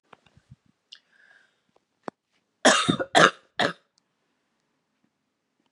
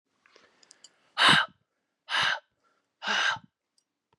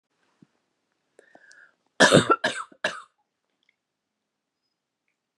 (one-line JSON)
{"cough_length": "5.7 s", "cough_amplitude": 30260, "cough_signal_mean_std_ratio": 0.23, "exhalation_length": "4.2 s", "exhalation_amplitude": 15187, "exhalation_signal_mean_std_ratio": 0.35, "three_cough_length": "5.4 s", "three_cough_amplitude": 28748, "three_cough_signal_mean_std_ratio": 0.22, "survey_phase": "beta (2021-08-13 to 2022-03-07)", "age": "45-64", "gender": "Female", "wearing_mask": "No", "symptom_cough_any": true, "symptom_runny_or_blocked_nose": true, "symptom_shortness_of_breath": true, "symptom_sore_throat": true, "symptom_fatigue": true, "symptom_headache": true, "symptom_onset": "5 days", "smoker_status": "Ex-smoker", "respiratory_condition_asthma": false, "respiratory_condition_other": false, "recruitment_source": "Test and Trace", "submission_delay": "3 days", "covid_test_result": "Negative", "covid_test_method": "RT-qPCR"}